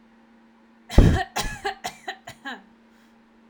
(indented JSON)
{
  "cough_length": "3.5 s",
  "cough_amplitude": 27884,
  "cough_signal_mean_std_ratio": 0.3,
  "survey_phase": "alpha (2021-03-01 to 2021-08-12)",
  "age": "18-44",
  "gender": "Female",
  "wearing_mask": "No",
  "symptom_cough_any": true,
  "symptom_headache": true,
  "smoker_status": "Never smoked",
  "respiratory_condition_asthma": false,
  "respiratory_condition_other": false,
  "recruitment_source": "Test and Trace",
  "submission_delay": "2 days",
  "covid_test_result": "Positive",
  "covid_test_method": "RT-qPCR",
  "covid_ct_value": 12.9,
  "covid_ct_gene": "ORF1ab gene",
  "covid_ct_mean": 13.5,
  "covid_viral_load": "37000000 copies/ml",
  "covid_viral_load_category": "High viral load (>1M copies/ml)"
}